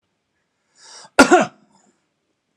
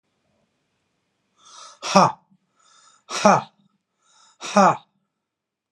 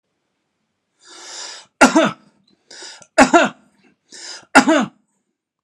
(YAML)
cough_length: 2.6 s
cough_amplitude: 32768
cough_signal_mean_std_ratio: 0.24
exhalation_length: 5.7 s
exhalation_amplitude: 32755
exhalation_signal_mean_std_ratio: 0.26
three_cough_length: 5.6 s
three_cough_amplitude: 32768
three_cough_signal_mean_std_ratio: 0.32
survey_phase: alpha (2021-03-01 to 2021-08-12)
age: 45-64
gender: Male
wearing_mask: 'No'
symptom_none: true
smoker_status: Ex-smoker
respiratory_condition_asthma: false
respiratory_condition_other: false
recruitment_source: REACT
submission_delay: 1 day
covid_test_result: Negative
covid_test_method: RT-qPCR